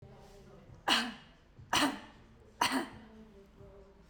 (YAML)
three_cough_length: 4.1 s
three_cough_amplitude: 7397
three_cough_signal_mean_std_ratio: 0.41
survey_phase: beta (2021-08-13 to 2022-03-07)
age: 45-64
gender: Female
wearing_mask: 'No'
symptom_none: true
smoker_status: Ex-smoker
respiratory_condition_asthma: false
respiratory_condition_other: false
recruitment_source: REACT
submission_delay: 4 days
covid_test_result: Negative
covid_test_method: RT-qPCR
covid_ct_value: 46.0
covid_ct_gene: N gene